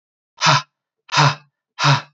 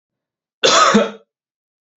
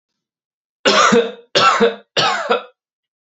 {
  "exhalation_length": "2.1 s",
  "exhalation_amplitude": 29649,
  "exhalation_signal_mean_std_ratio": 0.44,
  "cough_length": "2.0 s",
  "cough_amplitude": 30162,
  "cough_signal_mean_std_ratio": 0.4,
  "three_cough_length": "3.2 s",
  "three_cough_amplitude": 32767,
  "three_cough_signal_mean_std_ratio": 0.52,
  "survey_phase": "beta (2021-08-13 to 2022-03-07)",
  "age": "18-44",
  "gender": "Male",
  "wearing_mask": "No",
  "symptom_none": true,
  "smoker_status": "Never smoked",
  "respiratory_condition_asthma": false,
  "respiratory_condition_other": false,
  "recruitment_source": "REACT",
  "submission_delay": "1 day",
  "covid_test_result": "Negative",
  "covid_test_method": "RT-qPCR"
}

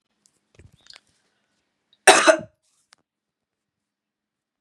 {
  "cough_length": "4.6 s",
  "cough_amplitude": 32768,
  "cough_signal_mean_std_ratio": 0.18,
  "survey_phase": "beta (2021-08-13 to 2022-03-07)",
  "age": "45-64",
  "gender": "Female",
  "wearing_mask": "No",
  "symptom_cough_any": true,
  "symptom_runny_or_blocked_nose": true,
  "symptom_sore_throat": true,
  "symptom_fatigue": true,
  "symptom_fever_high_temperature": true,
  "symptom_headache": true,
  "smoker_status": "Ex-smoker",
  "respiratory_condition_asthma": false,
  "respiratory_condition_other": false,
  "recruitment_source": "Test and Trace",
  "submission_delay": "2 days",
  "covid_test_result": "Positive",
  "covid_test_method": "RT-qPCR",
  "covid_ct_value": 25.0,
  "covid_ct_gene": "ORF1ab gene",
  "covid_ct_mean": 25.5,
  "covid_viral_load": "4400 copies/ml",
  "covid_viral_load_category": "Minimal viral load (< 10K copies/ml)"
}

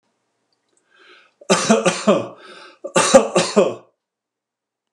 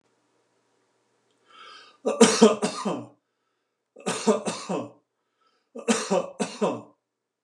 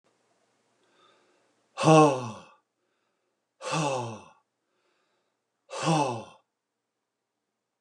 {
  "cough_length": "4.9 s",
  "cough_amplitude": 32768,
  "cough_signal_mean_std_ratio": 0.39,
  "three_cough_length": "7.4 s",
  "three_cough_amplitude": 30321,
  "three_cough_signal_mean_std_ratio": 0.36,
  "exhalation_length": "7.8 s",
  "exhalation_amplitude": 18782,
  "exhalation_signal_mean_std_ratio": 0.28,
  "survey_phase": "beta (2021-08-13 to 2022-03-07)",
  "age": "65+",
  "gender": "Male",
  "wearing_mask": "No",
  "symptom_none": true,
  "smoker_status": "Ex-smoker",
  "respiratory_condition_asthma": false,
  "respiratory_condition_other": false,
  "recruitment_source": "REACT",
  "submission_delay": "1 day",
  "covid_test_result": "Negative",
  "covid_test_method": "RT-qPCR"
}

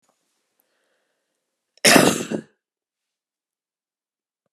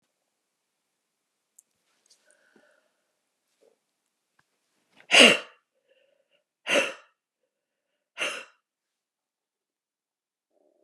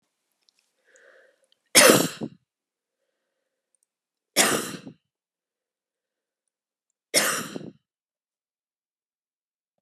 {
  "cough_length": "4.5 s",
  "cough_amplitude": 32768,
  "cough_signal_mean_std_ratio": 0.22,
  "exhalation_length": "10.8 s",
  "exhalation_amplitude": 30506,
  "exhalation_signal_mean_std_ratio": 0.16,
  "three_cough_length": "9.8 s",
  "three_cough_amplitude": 31986,
  "three_cough_signal_mean_std_ratio": 0.23,
  "survey_phase": "beta (2021-08-13 to 2022-03-07)",
  "age": "65+",
  "gender": "Female",
  "wearing_mask": "No",
  "symptom_runny_or_blocked_nose": true,
  "symptom_onset": "5 days",
  "smoker_status": "Never smoked",
  "respiratory_condition_asthma": true,
  "respiratory_condition_other": false,
  "recruitment_source": "REACT",
  "submission_delay": "1 day",
  "covid_test_result": "Negative",
  "covid_test_method": "RT-qPCR"
}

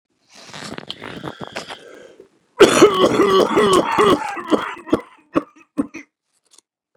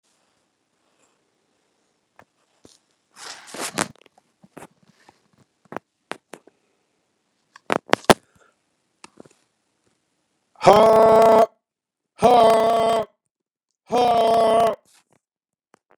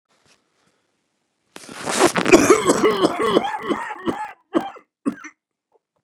{
  "three_cough_length": "7.0 s",
  "three_cough_amplitude": 32768,
  "three_cough_signal_mean_std_ratio": 0.45,
  "exhalation_length": "16.0 s",
  "exhalation_amplitude": 32768,
  "exhalation_signal_mean_std_ratio": 0.33,
  "cough_length": "6.0 s",
  "cough_amplitude": 32767,
  "cough_signal_mean_std_ratio": 0.44,
  "survey_phase": "beta (2021-08-13 to 2022-03-07)",
  "age": "65+",
  "gender": "Male",
  "wearing_mask": "No",
  "symptom_cough_any": true,
  "symptom_other": true,
  "symptom_onset": "2 days",
  "smoker_status": "Ex-smoker",
  "respiratory_condition_asthma": false,
  "respiratory_condition_other": false,
  "recruitment_source": "Test and Trace",
  "submission_delay": "2 days",
  "covid_test_result": "Positive",
  "covid_test_method": "RT-qPCR",
  "covid_ct_value": 26.3,
  "covid_ct_gene": "ORF1ab gene"
}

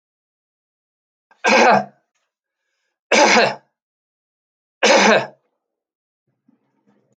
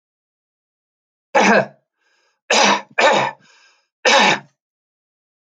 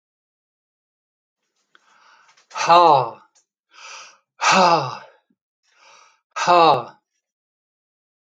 {
  "three_cough_length": "7.2 s",
  "three_cough_amplitude": 30298,
  "three_cough_signal_mean_std_ratio": 0.34,
  "cough_length": "5.5 s",
  "cough_amplitude": 29224,
  "cough_signal_mean_std_ratio": 0.39,
  "exhalation_length": "8.3 s",
  "exhalation_amplitude": 28855,
  "exhalation_signal_mean_std_ratio": 0.32,
  "survey_phase": "alpha (2021-03-01 to 2021-08-12)",
  "age": "65+",
  "gender": "Male",
  "wearing_mask": "No",
  "symptom_none": true,
  "smoker_status": "Never smoked",
  "respiratory_condition_asthma": false,
  "respiratory_condition_other": false,
  "recruitment_source": "REACT",
  "submission_delay": "1 day",
  "covid_test_result": "Negative",
  "covid_test_method": "RT-qPCR"
}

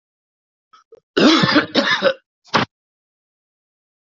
{
  "cough_length": "4.0 s",
  "cough_amplitude": 32768,
  "cough_signal_mean_std_ratio": 0.39,
  "survey_phase": "alpha (2021-03-01 to 2021-08-12)",
  "age": "18-44",
  "gender": "Male",
  "wearing_mask": "No",
  "symptom_none": true,
  "smoker_status": "Current smoker (11 or more cigarettes per day)",
  "respiratory_condition_asthma": true,
  "respiratory_condition_other": false,
  "recruitment_source": "REACT",
  "submission_delay": "4 days",
  "covid_test_result": "Negative",
  "covid_test_method": "RT-qPCR"
}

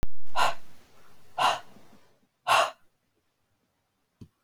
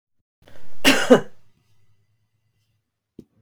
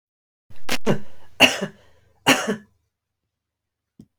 {
  "exhalation_length": "4.4 s",
  "exhalation_amplitude": 13598,
  "exhalation_signal_mean_std_ratio": 0.48,
  "cough_length": "3.4 s",
  "cough_amplitude": 32768,
  "cough_signal_mean_std_ratio": 0.36,
  "three_cough_length": "4.2 s",
  "three_cough_amplitude": 32768,
  "three_cough_signal_mean_std_ratio": 0.45,
  "survey_phase": "beta (2021-08-13 to 2022-03-07)",
  "age": "45-64",
  "gender": "Female",
  "wearing_mask": "No",
  "symptom_sore_throat": true,
  "smoker_status": "Never smoked",
  "respiratory_condition_asthma": true,
  "respiratory_condition_other": false,
  "recruitment_source": "Test and Trace",
  "submission_delay": "2 days",
  "covid_test_result": "Positive",
  "covid_test_method": "ePCR"
}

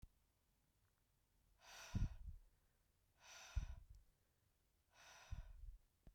{
  "exhalation_length": "6.1 s",
  "exhalation_amplitude": 836,
  "exhalation_signal_mean_std_ratio": 0.36,
  "survey_phase": "beta (2021-08-13 to 2022-03-07)",
  "age": "45-64",
  "gender": "Female",
  "wearing_mask": "No",
  "symptom_cough_any": true,
  "symptom_runny_or_blocked_nose": true,
  "symptom_sore_throat": true,
  "symptom_fatigue": true,
  "smoker_status": "Never smoked",
  "respiratory_condition_asthma": false,
  "respiratory_condition_other": false,
  "recruitment_source": "Test and Trace",
  "submission_delay": "2 days",
  "covid_test_result": "Positive",
  "covid_test_method": "RT-qPCR",
  "covid_ct_value": 16.7,
  "covid_ct_gene": "ORF1ab gene",
  "covid_ct_mean": 17.3,
  "covid_viral_load": "2100000 copies/ml",
  "covid_viral_load_category": "High viral load (>1M copies/ml)"
}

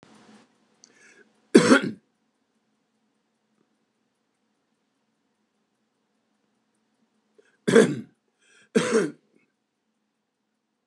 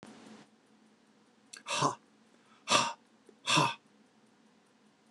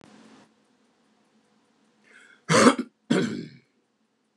{
  "three_cough_length": "10.9 s",
  "three_cough_amplitude": 29168,
  "three_cough_signal_mean_std_ratio": 0.21,
  "exhalation_length": "5.1 s",
  "exhalation_amplitude": 10008,
  "exhalation_signal_mean_std_ratio": 0.33,
  "cough_length": "4.4 s",
  "cough_amplitude": 25720,
  "cough_signal_mean_std_ratio": 0.28,
  "survey_phase": "beta (2021-08-13 to 2022-03-07)",
  "age": "65+",
  "gender": "Male",
  "wearing_mask": "No",
  "symptom_none": true,
  "smoker_status": "Never smoked",
  "respiratory_condition_asthma": false,
  "respiratory_condition_other": false,
  "recruitment_source": "REACT",
  "submission_delay": "1 day",
  "covid_test_result": "Negative",
  "covid_test_method": "RT-qPCR"
}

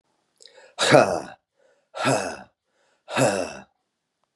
{
  "exhalation_length": "4.4 s",
  "exhalation_amplitude": 31815,
  "exhalation_signal_mean_std_ratio": 0.36,
  "survey_phase": "beta (2021-08-13 to 2022-03-07)",
  "age": "18-44",
  "gender": "Male",
  "wearing_mask": "No",
  "symptom_cough_any": true,
  "symptom_runny_or_blocked_nose": true,
  "symptom_fatigue": true,
  "symptom_headache": true,
  "smoker_status": "Current smoker (11 or more cigarettes per day)",
  "respiratory_condition_asthma": false,
  "respiratory_condition_other": false,
  "recruitment_source": "Test and Trace",
  "submission_delay": "2 days",
  "covid_test_result": "Negative",
  "covid_test_method": "RT-qPCR"
}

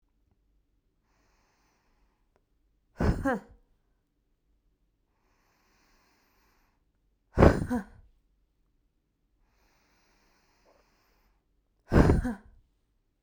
{
  "exhalation_length": "13.2 s",
  "exhalation_amplitude": 26807,
  "exhalation_signal_mean_std_ratio": 0.21,
  "survey_phase": "beta (2021-08-13 to 2022-03-07)",
  "age": "18-44",
  "gender": "Female",
  "wearing_mask": "No",
  "symptom_none": true,
  "smoker_status": "Never smoked",
  "respiratory_condition_asthma": false,
  "respiratory_condition_other": false,
  "recruitment_source": "REACT",
  "submission_delay": "8 days",
  "covid_test_result": "Negative",
  "covid_test_method": "RT-qPCR"
}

